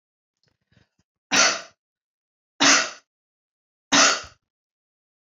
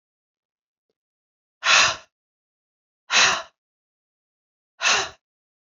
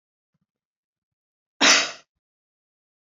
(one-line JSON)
{"three_cough_length": "5.2 s", "three_cough_amplitude": 22803, "three_cough_signal_mean_std_ratio": 0.31, "exhalation_length": "5.7 s", "exhalation_amplitude": 21530, "exhalation_signal_mean_std_ratio": 0.3, "cough_length": "3.1 s", "cough_amplitude": 22304, "cough_signal_mean_std_ratio": 0.23, "survey_phase": "beta (2021-08-13 to 2022-03-07)", "age": "45-64", "gender": "Female", "wearing_mask": "No", "symptom_none": true, "smoker_status": "Current smoker (1 to 10 cigarettes per day)", "respiratory_condition_asthma": false, "respiratory_condition_other": false, "recruitment_source": "REACT", "submission_delay": "1 day", "covid_test_result": "Negative", "covid_test_method": "RT-qPCR"}